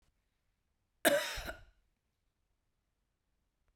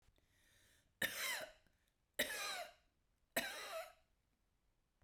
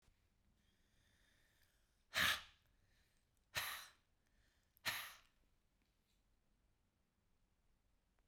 {
  "cough_length": "3.8 s",
  "cough_amplitude": 7327,
  "cough_signal_mean_std_ratio": 0.23,
  "three_cough_length": "5.0 s",
  "three_cough_amplitude": 2106,
  "three_cough_signal_mean_std_ratio": 0.42,
  "exhalation_length": "8.3 s",
  "exhalation_amplitude": 2346,
  "exhalation_signal_mean_std_ratio": 0.24,
  "survey_phase": "beta (2021-08-13 to 2022-03-07)",
  "age": "45-64",
  "gender": "Female",
  "wearing_mask": "No",
  "symptom_none": true,
  "smoker_status": "Never smoked",
  "respiratory_condition_asthma": true,
  "respiratory_condition_other": false,
  "recruitment_source": "REACT",
  "submission_delay": "15 days",
  "covid_test_result": "Negative",
  "covid_test_method": "RT-qPCR"
}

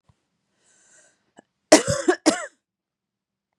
{
  "cough_length": "3.6 s",
  "cough_amplitude": 32768,
  "cough_signal_mean_std_ratio": 0.24,
  "survey_phase": "beta (2021-08-13 to 2022-03-07)",
  "age": "18-44",
  "gender": "Female",
  "wearing_mask": "No",
  "symptom_none": true,
  "symptom_onset": "13 days",
  "smoker_status": "Ex-smoker",
  "respiratory_condition_asthma": false,
  "respiratory_condition_other": false,
  "recruitment_source": "REACT",
  "submission_delay": "5 days",
  "covid_test_result": "Negative",
  "covid_test_method": "RT-qPCR",
  "influenza_a_test_result": "Negative",
  "influenza_b_test_result": "Negative"
}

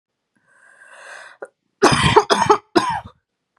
{
  "three_cough_length": "3.6 s",
  "three_cough_amplitude": 32767,
  "three_cough_signal_mean_std_ratio": 0.39,
  "survey_phase": "beta (2021-08-13 to 2022-03-07)",
  "age": "18-44",
  "gender": "Female",
  "wearing_mask": "No",
  "symptom_cough_any": true,
  "symptom_runny_or_blocked_nose": true,
  "symptom_fatigue": true,
  "symptom_onset": "3 days",
  "smoker_status": "Ex-smoker",
  "respiratory_condition_asthma": false,
  "respiratory_condition_other": false,
  "recruitment_source": "REACT",
  "submission_delay": "3 days",
  "covid_test_result": "Negative",
  "covid_test_method": "RT-qPCR"
}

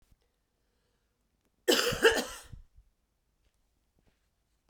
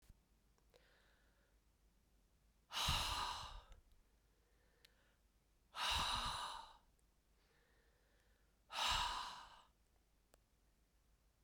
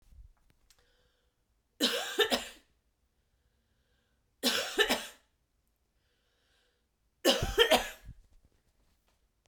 {
  "cough_length": "4.7 s",
  "cough_amplitude": 11998,
  "cough_signal_mean_std_ratio": 0.26,
  "exhalation_length": "11.4 s",
  "exhalation_amplitude": 1466,
  "exhalation_signal_mean_std_ratio": 0.4,
  "three_cough_length": "9.5 s",
  "three_cough_amplitude": 10992,
  "three_cough_signal_mean_std_ratio": 0.31,
  "survey_phase": "beta (2021-08-13 to 2022-03-07)",
  "age": "45-64",
  "gender": "Female",
  "wearing_mask": "No",
  "symptom_cough_any": true,
  "symptom_runny_or_blocked_nose": true,
  "symptom_shortness_of_breath": true,
  "symptom_onset": "12 days",
  "smoker_status": "Ex-smoker",
  "respiratory_condition_asthma": false,
  "respiratory_condition_other": false,
  "recruitment_source": "REACT",
  "submission_delay": "1 day",
  "covid_test_result": "Negative",
  "covid_test_method": "RT-qPCR",
  "covid_ct_value": 44.0,
  "covid_ct_gene": "N gene"
}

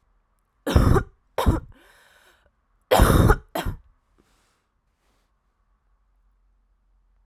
{
  "three_cough_length": "7.3 s",
  "three_cough_amplitude": 24054,
  "three_cough_signal_mean_std_ratio": 0.31,
  "survey_phase": "alpha (2021-03-01 to 2021-08-12)",
  "age": "18-44",
  "gender": "Female",
  "wearing_mask": "No",
  "symptom_new_continuous_cough": true,
  "symptom_fatigue": true,
  "symptom_headache": true,
  "symptom_onset": "5 days",
  "smoker_status": "Never smoked",
  "respiratory_condition_asthma": false,
  "respiratory_condition_other": false,
  "recruitment_source": "Test and Trace",
  "submission_delay": "2 days",
  "covid_test_result": "Positive",
  "covid_test_method": "RT-qPCR"
}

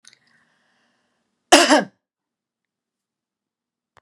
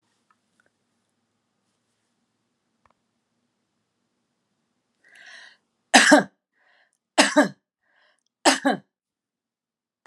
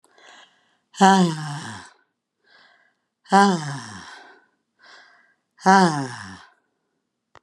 {
  "cough_length": "4.0 s",
  "cough_amplitude": 32768,
  "cough_signal_mean_std_ratio": 0.21,
  "three_cough_length": "10.1 s",
  "three_cough_amplitude": 32035,
  "three_cough_signal_mean_std_ratio": 0.21,
  "exhalation_length": "7.4 s",
  "exhalation_amplitude": 31621,
  "exhalation_signal_mean_std_ratio": 0.32,
  "survey_phase": "beta (2021-08-13 to 2022-03-07)",
  "age": "65+",
  "gender": "Female",
  "wearing_mask": "No",
  "symptom_none": true,
  "smoker_status": "Never smoked",
  "respiratory_condition_asthma": false,
  "respiratory_condition_other": false,
  "recruitment_source": "REACT",
  "submission_delay": "1 day",
  "covid_test_result": "Negative",
  "covid_test_method": "RT-qPCR"
}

